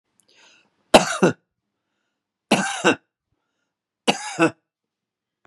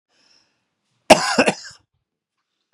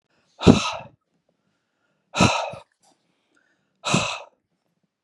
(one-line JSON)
{"three_cough_length": "5.5 s", "three_cough_amplitude": 32768, "three_cough_signal_mean_std_ratio": 0.28, "cough_length": "2.7 s", "cough_amplitude": 32768, "cough_signal_mean_std_ratio": 0.24, "exhalation_length": "5.0 s", "exhalation_amplitude": 32768, "exhalation_signal_mean_std_ratio": 0.28, "survey_phase": "beta (2021-08-13 to 2022-03-07)", "age": "45-64", "gender": "Male", "wearing_mask": "No", "symptom_none": true, "smoker_status": "Ex-smoker", "respiratory_condition_asthma": false, "respiratory_condition_other": false, "recruitment_source": "REACT", "submission_delay": "1 day", "covid_test_result": "Negative", "covid_test_method": "RT-qPCR", "influenza_a_test_result": "Negative", "influenza_b_test_result": "Negative"}